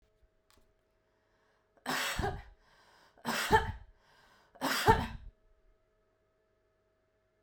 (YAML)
three_cough_length: 7.4 s
three_cough_amplitude: 10892
three_cough_signal_mean_std_ratio: 0.32
survey_phase: beta (2021-08-13 to 2022-03-07)
age: 18-44
gender: Female
wearing_mask: 'No'
symptom_none: true
smoker_status: Never smoked
respiratory_condition_asthma: false
respiratory_condition_other: false
recruitment_source: REACT
submission_delay: 1 day
covid_test_result: Negative
covid_test_method: RT-qPCR